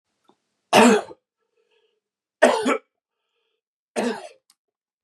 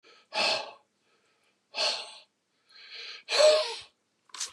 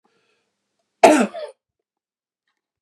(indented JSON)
{
  "three_cough_length": "5.0 s",
  "three_cough_amplitude": 32007,
  "three_cough_signal_mean_std_ratio": 0.3,
  "exhalation_length": "4.5 s",
  "exhalation_amplitude": 10701,
  "exhalation_signal_mean_std_ratio": 0.39,
  "cough_length": "2.8 s",
  "cough_amplitude": 32768,
  "cough_signal_mean_std_ratio": 0.24,
  "survey_phase": "beta (2021-08-13 to 2022-03-07)",
  "age": "45-64",
  "gender": "Male",
  "wearing_mask": "No",
  "symptom_none": true,
  "smoker_status": "Never smoked",
  "respiratory_condition_asthma": false,
  "respiratory_condition_other": false,
  "recruitment_source": "REACT",
  "submission_delay": "2 days",
  "covid_test_result": "Negative",
  "covid_test_method": "RT-qPCR",
  "influenza_a_test_result": "Negative",
  "influenza_b_test_result": "Negative"
}